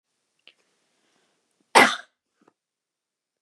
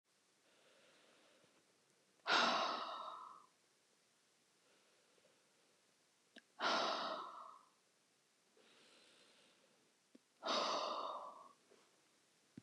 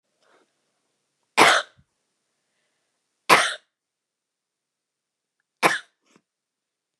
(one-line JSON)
{"cough_length": "3.4 s", "cough_amplitude": 31573, "cough_signal_mean_std_ratio": 0.17, "exhalation_length": "12.6 s", "exhalation_amplitude": 2562, "exhalation_signal_mean_std_ratio": 0.37, "three_cough_length": "7.0 s", "three_cough_amplitude": 31976, "three_cough_signal_mean_std_ratio": 0.21, "survey_phase": "beta (2021-08-13 to 2022-03-07)", "age": "18-44", "gender": "Female", "wearing_mask": "No", "symptom_none": true, "smoker_status": "Never smoked", "respiratory_condition_asthma": false, "respiratory_condition_other": false, "recruitment_source": "REACT", "submission_delay": "1 day", "covid_test_result": "Negative", "covid_test_method": "RT-qPCR", "influenza_a_test_result": "Negative", "influenza_b_test_result": "Negative"}